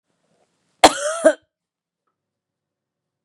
{"cough_length": "3.2 s", "cough_amplitude": 32768, "cough_signal_mean_std_ratio": 0.21, "survey_phase": "beta (2021-08-13 to 2022-03-07)", "age": "45-64", "gender": "Female", "wearing_mask": "No", "symptom_cough_any": true, "symptom_sore_throat": true, "symptom_onset": "4 days", "smoker_status": "Never smoked", "respiratory_condition_asthma": true, "respiratory_condition_other": false, "recruitment_source": "Test and Trace", "submission_delay": "1 day", "covid_test_result": "Positive", "covid_test_method": "RT-qPCR", "covid_ct_value": 26.8, "covid_ct_gene": "ORF1ab gene", "covid_ct_mean": 27.9, "covid_viral_load": "720 copies/ml", "covid_viral_load_category": "Minimal viral load (< 10K copies/ml)"}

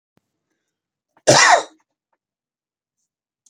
{"cough_length": "3.5 s", "cough_amplitude": 32767, "cough_signal_mean_std_ratio": 0.25, "survey_phase": "beta (2021-08-13 to 2022-03-07)", "age": "65+", "gender": "Male", "wearing_mask": "No", "symptom_none": true, "smoker_status": "Ex-smoker", "respiratory_condition_asthma": false, "respiratory_condition_other": true, "recruitment_source": "Test and Trace", "submission_delay": "1 day", "covid_test_result": "Negative", "covid_test_method": "ePCR"}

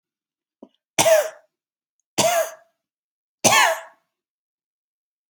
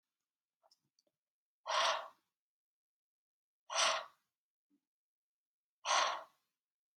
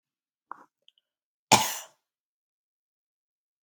{"three_cough_length": "5.3 s", "three_cough_amplitude": 29449, "three_cough_signal_mean_std_ratio": 0.34, "exhalation_length": "7.0 s", "exhalation_amplitude": 3377, "exhalation_signal_mean_std_ratio": 0.3, "cough_length": "3.6 s", "cough_amplitude": 26597, "cough_signal_mean_std_ratio": 0.17, "survey_phase": "alpha (2021-03-01 to 2021-08-12)", "age": "18-44", "gender": "Female", "wearing_mask": "No", "symptom_none": true, "smoker_status": "Never smoked", "respiratory_condition_asthma": false, "respiratory_condition_other": false, "recruitment_source": "REACT", "submission_delay": "1 day", "covid_test_result": "Negative", "covid_test_method": "RT-qPCR"}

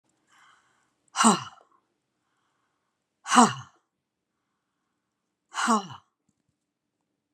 {"exhalation_length": "7.3 s", "exhalation_amplitude": 26856, "exhalation_signal_mean_std_ratio": 0.23, "survey_phase": "beta (2021-08-13 to 2022-03-07)", "age": "65+", "gender": "Female", "wearing_mask": "No", "symptom_none": true, "smoker_status": "Never smoked", "respiratory_condition_asthma": false, "respiratory_condition_other": false, "recruitment_source": "REACT", "submission_delay": "0 days", "covid_test_result": "Negative", "covid_test_method": "RT-qPCR"}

